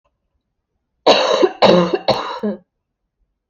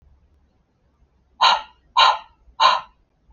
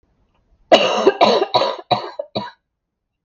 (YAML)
three_cough_length: 3.5 s
three_cough_amplitude: 29575
three_cough_signal_mean_std_ratio: 0.44
exhalation_length: 3.3 s
exhalation_amplitude: 27344
exhalation_signal_mean_std_ratio: 0.34
cough_length: 3.2 s
cough_amplitude: 32768
cough_signal_mean_std_ratio: 0.45
survey_phase: alpha (2021-03-01 to 2021-08-12)
age: 18-44
gender: Female
wearing_mask: 'No'
symptom_cough_any: true
symptom_new_continuous_cough: true
symptom_diarrhoea: true
symptom_fatigue: true
symptom_headache: true
symptom_change_to_sense_of_smell_or_taste: true
symptom_onset: 7 days
smoker_status: Ex-smoker
respiratory_condition_asthma: false
respiratory_condition_other: false
recruitment_source: Test and Trace
submission_delay: 3 days
covid_test_result: Positive
covid_test_method: RT-qPCR
covid_ct_value: 15.6
covid_ct_gene: S gene
covid_ct_mean: 16.1
covid_viral_load: 5400000 copies/ml
covid_viral_load_category: High viral load (>1M copies/ml)